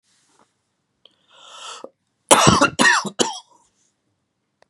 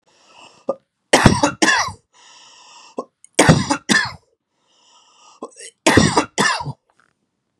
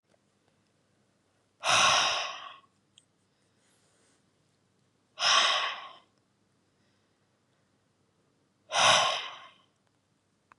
{"cough_length": "4.7 s", "cough_amplitude": 32768, "cough_signal_mean_std_ratio": 0.32, "three_cough_length": "7.6 s", "three_cough_amplitude": 32768, "three_cough_signal_mean_std_ratio": 0.38, "exhalation_length": "10.6 s", "exhalation_amplitude": 13024, "exhalation_signal_mean_std_ratio": 0.33, "survey_phase": "beta (2021-08-13 to 2022-03-07)", "age": "18-44", "gender": "Male", "wearing_mask": "No", "symptom_runny_or_blocked_nose": true, "symptom_onset": "7 days", "smoker_status": "Never smoked", "respiratory_condition_asthma": false, "respiratory_condition_other": false, "recruitment_source": "REACT", "submission_delay": "1 day", "covid_test_result": "Negative", "covid_test_method": "RT-qPCR", "influenza_a_test_result": "Negative", "influenza_b_test_result": "Negative"}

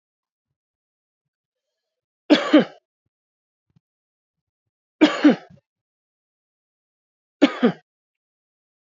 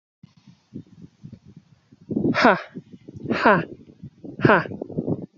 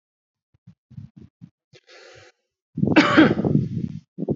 {"three_cough_length": "9.0 s", "three_cough_amplitude": 26058, "three_cough_signal_mean_std_ratio": 0.21, "exhalation_length": "5.4 s", "exhalation_amplitude": 29277, "exhalation_signal_mean_std_ratio": 0.38, "cough_length": "4.4 s", "cough_amplitude": 26379, "cough_signal_mean_std_ratio": 0.38, "survey_phase": "beta (2021-08-13 to 2022-03-07)", "age": "45-64", "gender": "Male", "wearing_mask": "No", "symptom_fatigue": true, "symptom_onset": "2 days", "smoker_status": "Never smoked", "respiratory_condition_asthma": false, "respiratory_condition_other": false, "recruitment_source": "Test and Trace", "submission_delay": "2 days", "covid_test_result": "Positive", "covid_test_method": "RT-qPCR", "covid_ct_value": 19.3, "covid_ct_gene": "ORF1ab gene"}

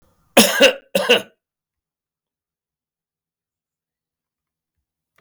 {"cough_length": "5.2 s", "cough_amplitude": 32768, "cough_signal_mean_std_ratio": 0.24, "survey_phase": "beta (2021-08-13 to 2022-03-07)", "age": "45-64", "gender": "Male", "wearing_mask": "No", "symptom_cough_any": true, "symptom_runny_or_blocked_nose": true, "symptom_sore_throat": true, "symptom_fatigue": true, "symptom_headache": true, "symptom_other": true, "smoker_status": "Never smoked", "respiratory_condition_asthma": false, "respiratory_condition_other": false, "recruitment_source": "Test and Trace", "submission_delay": "2 days", "covid_test_result": "Positive", "covid_test_method": "LFT"}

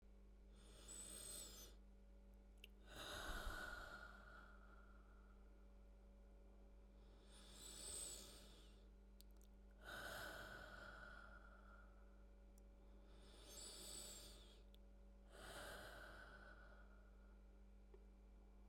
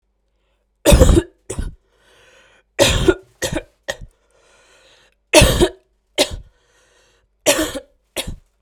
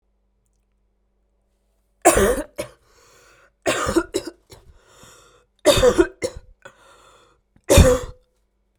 {"exhalation_length": "18.7 s", "exhalation_amplitude": 456, "exhalation_signal_mean_std_ratio": 0.98, "three_cough_length": "8.6 s", "three_cough_amplitude": 32768, "three_cough_signal_mean_std_ratio": 0.34, "cough_length": "8.8 s", "cough_amplitude": 32768, "cough_signal_mean_std_ratio": 0.33, "survey_phase": "beta (2021-08-13 to 2022-03-07)", "age": "18-44", "gender": "Female", "wearing_mask": "No", "symptom_cough_any": true, "symptom_runny_or_blocked_nose": true, "symptom_sore_throat": true, "symptom_fatigue": true, "symptom_fever_high_temperature": true, "symptom_headache": true, "symptom_other": true, "symptom_onset": "6 days", "smoker_status": "Never smoked", "respiratory_condition_asthma": false, "respiratory_condition_other": false, "recruitment_source": "Test and Trace", "submission_delay": "2 days", "covid_test_result": "Positive", "covid_test_method": "RT-qPCR", "covid_ct_value": 26.1, "covid_ct_gene": "N gene"}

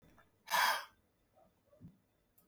{"exhalation_length": "2.5 s", "exhalation_amplitude": 3535, "exhalation_signal_mean_std_ratio": 0.31, "survey_phase": "beta (2021-08-13 to 2022-03-07)", "age": "65+", "gender": "Male", "wearing_mask": "No", "symptom_none": true, "smoker_status": "Ex-smoker", "respiratory_condition_asthma": false, "respiratory_condition_other": false, "recruitment_source": "REACT", "submission_delay": "2 days", "covid_test_result": "Negative", "covid_test_method": "RT-qPCR", "influenza_a_test_result": "Negative", "influenza_b_test_result": "Negative"}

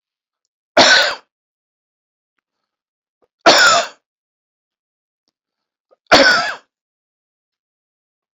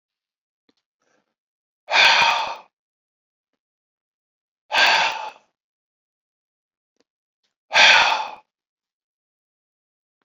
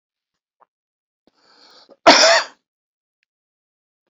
{"three_cough_length": "8.4 s", "three_cough_amplitude": 31296, "three_cough_signal_mean_std_ratio": 0.3, "exhalation_length": "10.2 s", "exhalation_amplitude": 30785, "exhalation_signal_mean_std_ratio": 0.3, "cough_length": "4.1 s", "cough_amplitude": 32153, "cough_signal_mean_std_ratio": 0.24, "survey_phase": "beta (2021-08-13 to 2022-03-07)", "age": "45-64", "gender": "Male", "wearing_mask": "No", "symptom_none": true, "smoker_status": "Never smoked", "respiratory_condition_asthma": false, "respiratory_condition_other": false, "recruitment_source": "REACT", "submission_delay": "3 days", "covid_test_result": "Negative", "covid_test_method": "RT-qPCR", "influenza_a_test_result": "Unknown/Void", "influenza_b_test_result": "Unknown/Void"}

